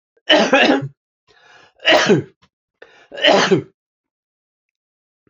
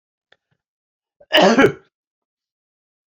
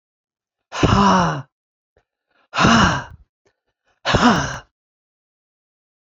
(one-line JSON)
{"three_cough_length": "5.3 s", "three_cough_amplitude": 30075, "three_cough_signal_mean_std_ratio": 0.41, "cough_length": "3.2 s", "cough_amplitude": 28349, "cough_signal_mean_std_ratio": 0.28, "exhalation_length": "6.1 s", "exhalation_amplitude": 29113, "exhalation_signal_mean_std_ratio": 0.41, "survey_phase": "beta (2021-08-13 to 2022-03-07)", "age": "65+", "gender": "Male", "wearing_mask": "No", "symptom_none": true, "smoker_status": "Never smoked", "respiratory_condition_asthma": false, "respiratory_condition_other": false, "recruitment_source": "Test and Trace", "submission_delay": "1 day", "covid_test_result": "Negative", "covid_test_method": "ePCR"}